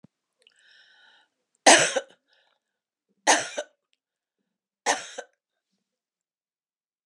{
  "three_cough_length": "7.1 s",
  "three_cough_amplitude": 29743,
  "three_cough_signal_mean_std_ratio": 0.21,
  "survey_phase": "beta (2021-08-13 to 2022-03-07)",
  "age": "65+",
  "gender": "Female",
  "wearing_mask": "No",
  "symptom_cough_any": true,
  "symptom_runny_or_blocked_nose": true,
  "symptom_diarrhoea": true,
  "symptom_other": true,
  "smoker_status": "Never smoked",
  "respiratory_condition_asthma": false,
  "respiratory_condition_other": false,
  "recruitment_source": "Test and Trace",
  "submission_delay": "1 day",
  "covid_test_result": "Positive",
  "covid_test_method": "LFT"
}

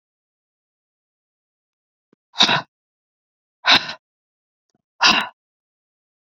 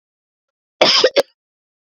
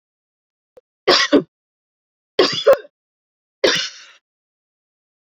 {
  "exhalation_length": "6.2 s",
  "exhalation_amplitude": 32768,
  "exhalation_signal_mean_std_ratio": 0.24,
  "cough_length": "1.9 s",
  "cough_amplitude": 29482,
  "cough_signal_mean_std_ratio": 0.33,
  "three_cough_length": "5.3 s",
  "three_cough_amplitude": 29742,
  "three_cough_signal_mean_std_ratio": 0.3,
  "survey_phase": "beta (2021-08-13 to 2022-03-07)",
  "age": "45-64",
  "gender": "Female",
  "wearing_mask": "No",
  "symptom_cough_any": true,
  "symptom_runny_or_blocked_nose": true,
  "symptom_fatigue": true,
  "symptom_change_to_sense_of_smell_or_taste": true,
  "symptom_loss_of_taste": true,
  "symptom_other": true,
  "symptom_onset": "7 days",
  "smoker_status": "Never smoked",
  "respiratory_condition_asthma": true,
  "respiratory_condition_other": false,
  "recruitment_source": "Test and Trace",
  "submission_delay": "2 days",
  "covid_test_result": "Positive",
  "covid_test_method": "RT-qPCR",
  "covid_ct_value": 16.1,
  "covid_ct_gene": "ORF1ab gene",
  "covid_ct_mean": 16.5,
  "covid_viral_load": "3900000 copies/ml",
  "covid_viral_load_category": "High viral load (>1M copies/ml)"
}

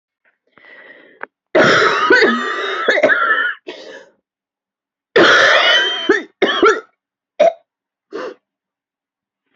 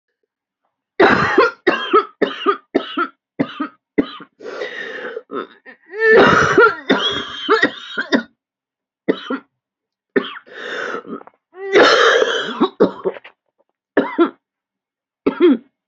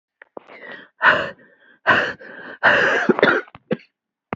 {
  "cough_length": "9.6 s",
  "cough_amplitude": 32767,
  "cough_signal_mean_std_ratio": 0.52,
  "three_cough_length": "15.9 s",
  "three_cough_amplitude": 32768,
  "three_cough_signal_mean_std_ratio": 0.48,
  "exhalation_length": "4.4 s",
  "exhalation_amplitude": 28168,
  "exhalation_signal_mean_std_ratio": 0.46,
  "survey_phase": "beta (2021-08-13 to 2022-03-07)",
  "age": "18-44",
  "gender": "Female",
  "wearing_mask": "No",
  "symptom_cough_any": true,
  "symptom_runny_or_blocked_nose": true,
  "symptom_shortness_of_breath": true,
  "symptom_sore_throat": true,
  "symptom_diarrhoea": true,
  "symptom_fatigue": true,
  "symptom_headache": true,
  "symptom_change_to_sense_of_smell_or_taste": true,
  "symptom_loss_of_taste": true,
  "smoker_status": "Current smoker (e-cigarettes or vapes only)",
  "respiratory_condition_asthma": false,
  "respiratory_condition_other": false,
  "recruitment_source": "Test and Trace",
  "submission_delay": "1 day",
  "covid_test_result": "Positive",
  "covid_test_method": "RT-qPCR",
  "covid_ct_value": 14.6,
  "covid_ct_gene": "ORF1ab gene",
  "covid_ct_mean": 15.0,
  "covid_viral_load": "12000000 copies/ml",
  "covid_viral_load_category": "High viral load (>1M copies/ml)"
}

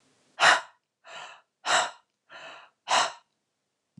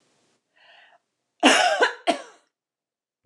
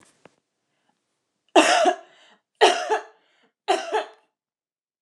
{
  "exhalation_length": "4.0 s",
  "exhalation_amplitude": 18738,
  "exhalation_signal_mean_std_ratio": 0.33,
  "cough_length": "3.3 s",
  "cough_amplitude": 27605,
  "cough_signal_mean_std_ratio": 0.33,
  "three_cough_length": "5.0 s",
  "three_cough_amplitude": 27449,
  "three_cough_signal_mean_std_ratio": 0.34,
  "survey_phase": "beta (2021-08-13 to 2022-03-07)",
  "age": "45-64",
  "gender": "Female",
  "wearing_mask": "No",
  "symptom_none": true,
  "smoker_status": "Never smoked",
  "respiratory_condition_asthma": false,
  "respiratory_condition_other": false,
  "recruitment_source": "REACT",
  "submission_delay": "3 days",
  "covid_test_result": "Negative",
  "covid_test_method": "RT-qPCR",
  "influenza_a_test_result": "Negative",
  "influenza_b_test_result": "Negative"
}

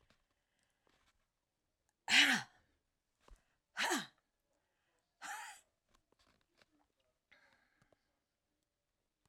{
  "three_cough_length": "9.3 s",
  "three_cough_amplitude": 5688,
  "three_cough_signal_mean_std_ratio": 0.21,
  "survey_phase": "alpha (2021-03-01 to 2021-08-12)",
  "age": "65+",
  "gender": "Female",
  "wearing_mask": "No",
  "symptom_none": true,
  "smoker_status": "Never smoked",
  "respiratory_condition_asthma": false,
  "respiratory_condition_other": false,
  "recruitment_source": "REACT",
  "submission_delay": "3 days",
  "covid_test_result": "Negative",
  "covid_test_method": "RT-qPCR"
}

